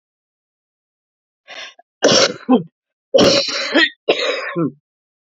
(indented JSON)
{
  "cough_length": "5.2 s",
  "cough_amplitude": 31029,
  "cough_signal_mean_std_ratio": 0.45,
  "survey_phase": "alpha (2021-03-01 to 2021-08-12)",
  "age": "45-64",
  "gender": "Female",
  "wearing_mask": "No",
  "symptom_cough_any": true,
  "symptom_new_continuous_cough": true,
  "symptom_shortness_of_breath": true,
  "symptom_diarrhoea": true,
  "symptom_fatigue": true,
  "symptom_fever_high_temperature": true,
  "symptom_headache": true,
  "symptom_change_to_sense_of_smell_or_taste": true,
  "symptom_loss_of_taste": true,
  "smoker_status": "Ex-smoker",
  "respiratory_condition_asthma": true,
  "respiratory_condition_other": true,
  "recruitment_source": "Test and Trace",
  "submission_delay": "4 days",
  "covid_test_result": "Positive",
  "covid_test_method": "LFT"
}